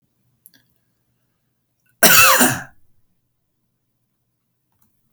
{"cough_length": "5.1 s", "cough_amplitude": 32768, "cough_signal_mean_std_ratio": 0.26, "survey_phase": "alpha (2021-03-01 to 2021-08-12)", "age": "45-64", "gender": "Male", "wearing_mask": "No", "symptom_none": true, "smoker_status": "Never smoked", "respiratory_condition_asthma": false, "respiratory_condition_other": false, "recruitment_source": "REACT", "submission_delay": "3 days", "covid_test_result": "Negative", "covid_test_method": "RT-qPCR"}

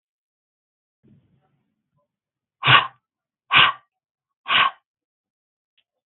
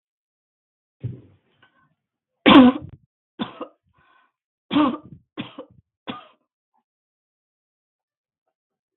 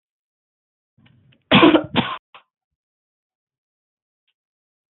{"exhalation_length": "6.1 s", "exhalation_amplitude": 32766, "exhalation_signal_mean_std_ratio": 0.24, "three_cough_length": "9.0 s", "three_cough_amplitude": 32768, "three_cough_signal_mean_std_ratio": 0.2, "cough_length": "4.9 s", "cough_amplitude": 32552, "cough_signal_mean_std_ratio": 0.23, "survey_phase": "beta (2021-08-13 to 2022-03-07)", "age": "45-64", "gender": "Female", "wearing_mask": "No", "symptom_fatigue": true, "symptom_onset": "12 days", "smoker_status": "Current smoker (1 to 10 cigarettes per day)", "respiratory_condition_asthma": false, "respiratory_condition_other": false, "recruitment_source": "REACT", "submission_delay": "1 day", "covid_test_result": "Negative", "covid_test_method": "RT-qPCR", "influenza_a_test_result": "Negative", "influenza_b_test_result": "Negative"}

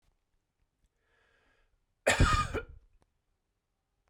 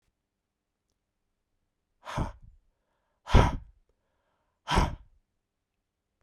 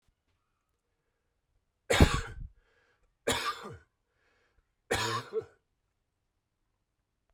{"cough_length": "4.1 s", "cough_amplitude": 8037, "cough_signal_mean_std_ratio": 0.27, "exhalation_length": "6.2 s", "exhalation_amplitude": 15457, "exhalation_signal_mean_std_ratio": 0.22, "three_cough_length": "7.3 s", "three_cough_amplitude": 19064, "three_cough_signal_mean_std_ratio": 0.26, "survey_phase": "beta (2021-08-13 to 2022-03-07)", "age": "45-64", "gender": "Male", "wearing_mask": "No", "symptom_runny_or_blocked_nose": true, "symptom_sore_throat": true, "symptom_fatigue": true, "symptom_change_to_sense_of_smell_or_taste": true, "symptom_other": true, "smoker_status": "Never smoked", "respiratory_condition_asthma": false, "respiratory_condition_other": false, "recruitment_source": "Test and Trace", "submission_delay": "1 day", "covid_test_result": "Positive", "covid_test_method": "RT-qPCR"}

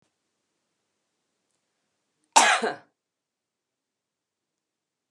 {"cough_length": "5.1 s", "cough_amplitude": 27505, "cough_signal_mean_std_ratio": 0.19, "survey_phase": "beta (2021-08-13 to 2022-03-07)", "age": "45-64", "gender": "Female", "wearing_mask": "No", "symptom_runny_or_blocked_nose": true, "smoker_status": "Never smoked", "respiratory_condition_asthma": true, "respiratory_condition_other": false, "recruitment_source": "REACT", "submission_delay": "1 day", "covid_test_result": "Negative", "covid_test_method": "RT-qPCR", "influenza_a_test_result": "Negative", "influenza_b_test_result": "Negative"}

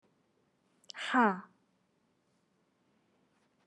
{"exhalation_length": "3.7 s", "exhalation_amplitude": 6648, "exhalation_signal_mean_std_ratio": 0.23, "survey_phase": "beta (2021-08-13 to 2022-03-07)", "age": "18-44", "gender": "Female", "wearing_mask": "Yes", "symptom_none": true, "symptom_onset": "4 days", "smoker_status": "Never smoked", "respiratory_condition_asthma": false, "respiratory_condition_other": false, "recruitment_source": "REACT", "submission_delay": "1 day", "covid_test_result": "Negative", "covid_test_method": "RT-qPCR", "influenza_a_test_result": "Unknown/Void", "influenza_b_test_result": "Unknown/Void"}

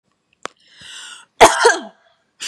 {"cough_length": "2.5 s", "cough_amplitude": 32768, "cough_signal_mean_std_ratio": 0.3, "survey_phase": "beta (2021-08-13 to 2022-03-07)", "age": "18-44", "gender": "Female", "wearing_mask": "No", "symptom_none": true, "smoker_status": "Never smoked", "respiratory_condition_asthma": false, "respiratory_condition_other": false, "recruitment_source": "REACT", "submission_delay": "1 day", "covid_test_result": "Negative", "covid_test_method": "RT-qPCR", "influenza_a_test_result": "Negative", "influenza_b_test_result": "Negative"}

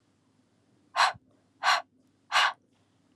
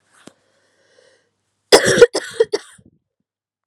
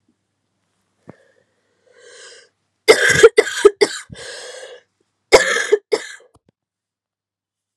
{"exhalation_length": "3.2 s", "exhalation_amplitude": 9800, "exhalation_signal_mean_std_ratio": 0.33, "three_cough_length": "3.7 s", "three_cough_amplitude": 32768, "three_cough_signal_mean_std_ratio": 0.26, "cough_length": "7.8 s", "cough_amplitude": 32768, "cough_signal_mean_std_ratio": 0.28, "survey_phase": "alpha (2021-03-01 to 2021-08-12)", "age": "18-44", "gender": "Female", "wearing_mask": "No", "symptom_cough_any": true, "symptom_new_continuous_cough": true, "symptom_shortness_of_breath": true, "symptom_fatigue": true, "symptom_fever_high_temperature": true, "symptom_change_to_sense_of_smell_or_taste": true, "symptom_loss_of_taste": true, "symptom_onset": "3 days", "smoker_status": "Never smoked", "respiratory_condition_asthma": true, "respiratory_condition_other": false, "recruitment_source": "Test and Trace", "submission_delay": "2 days", "covid_test_result": "Positive", "covid_test_method": "RT-qPCR", "covid_ct_value": 14.8, "covid_ct_gene": "ORF1ab gene", "covid_ct_mean": 15.2, "covid_viral_load": "11000000 copies/ml", "covid_viral_load_category": "High viral load (>1M copies/ml)"}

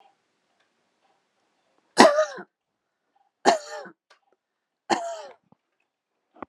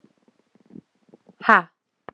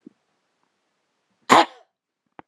{"three_cough_length": "6.5 s", "three_cough_amplitude": 32767, "three_cough_signal_mean_std_ratio": 0.23, "exhalation_length": "2.1 s", "exhalation_amplitude": 31923, "exhalation_signal_mean_std_ratio": 0.18, "cough_length": "2.5 s", "cough_amplitude": 32293, "cough_signal_mean_std_ratio": 0.19, "survey_phase": "beta (2021-08-13 to 2022-03-07)", "age": "18-44", "gender": "Female", "wearing_mask": "No", "symptom_none": true, "smoker_status": "Never smoked", "respiratory_condition_asthma": false, "respiratory_condition_other": false, "recruitment_source": "REACT", "submission_delay": "4 days", "covid_test_result": "Negative", "covid_test_method": "RT-qPCR"}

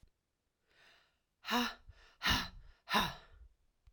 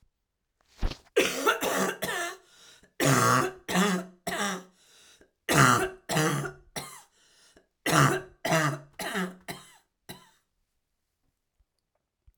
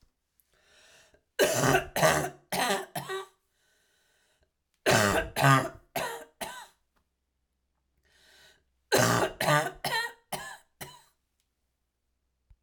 {"exhalation_length": "3.9 s", "exhalation_amplitude": 4672, "exhalation_signal_mean_std_ratio": 0.37, "cough_length": "12.4 s", "cough_amplitude": 19443, "cough_signal_mean_std_ratio": 0.46, "three_cough_length": "12.6 s", "three_cough_amplitude": 13283, "three_cough_signal_mean_std_ratio": 0.4, "survey_phase": "alpha (2021-03-01 to 2021-08-12)", "age": "45-64", "gender": "Female", "wearing_mask": "No", "symptom_cough_any": true, "symptom_headache": true, "symptom_onset": "5 days", "smoker_status": "Never smoked", "respiratory_condition_asthma": true, "respiratory_condition_other": false, "recruitment_source": "Test and Trace", "submission_delay": "1 day", "covid_test_result": "Positive", "covid_test_method": "RT-qPCR", "covid_ct_value": 16.7, "covid_ct_gene": "ORF1ab gene", "covid_ct_mean": 17.0, "covid_viral_load": "2600000 copies/ml", "covid_viral_load_category": "High viral load (>1M copies/ml)"}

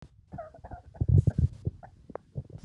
{"cough_length": "2.6 s", "cough_amplitude": 10594, "cough_signal_mean_std_ratio": 0.35, "survey_phase": "alpha (2021-03-01 to 2021-08-12)", "age": "65+", "gender": "Male", "wearing_mask": "No", "symptom_none": true, "smoker_status": "Never smoked", "respiratory_condition_asthma": false, "respiratory_condition_other": false, "recruitment_source": "REACT", "submission_delay": "2 days", "covid_test_result": "Negative", "covid_test_method": "RT-qPCR"}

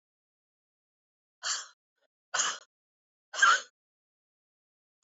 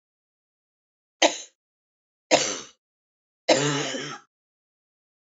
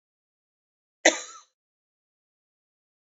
{"exhalation_length": "5.0 s", "exhalation_amplitude": 9461, "exhalation_signal_mean_std_ratio": 0.24, "three_cough_length": "5.3 s", "three_cough_amplitude": 25936, "three_cough_signal_mean_std_ratio": 0.3, "cough_length": "3.2 s", "cough_amplitude": 22073, "cough_signal_mean_std_ratio": 0.13, "survey_phase": "beta (2021-08-13 to 2022-03-07)", "age": "45-64", "gender": "Female", "wearing_mask": "No", "symptom_cough_any": true, "symptom_runny_or_blocked_nose": true, "symptom_sore_throat": true, "symptom_fatigue": true, "symptom_headache": true, "symptom_change_to_sense_of_smell_or_taste": true, "smoker_status": "Never smoked", "respiratory_condition_asthma": false, "respiratory_condition_other": false, "recruitment_source": "Test and Trace", "submission_delay": "1 day", "covid_test_result": "Positive", "covid_test_method": "RT-qPCR", "covid_ct_value": 16.4, "covid_ct_gene": "ORF1ab gene", "covid_ct_mean": 17.0, "covid_viral_load": "2600000 copies/ml", "covid_viral_load_category": "High viral load (>1M copies/ml)"}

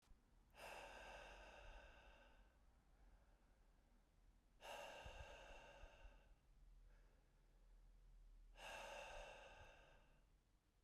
{"exhalation_length": "10.8 s", "exhalation_amplitude": 232, "exhalation_signal_mean_std_ratio": 0.81, "survey_phase": "beta (2021-08-13 to 2022-03-07)", "age": "18-44", "gender": "Male", "wearing_mask": "No", "symptom_runny_or_blocked_nose": true, "symptom_sore_throat": true, "symptom_change_to_sense_of_smell_or_taste": true, "symptom_loss_of_taste": true, "symptom_onset": "6 days", "smoker_status": "Never smoked", "respiratory_condition_asthma": false, "respiratory_condition_other": false, "recruitment_source": "Test and Trace", "submission_delay": "2 days", "covid_test_result": "Positive", "covid_test_method": "RT-qPCR", "covid_ct_value": 17.7, "covid_ct_gene": "ORF1ab gene"}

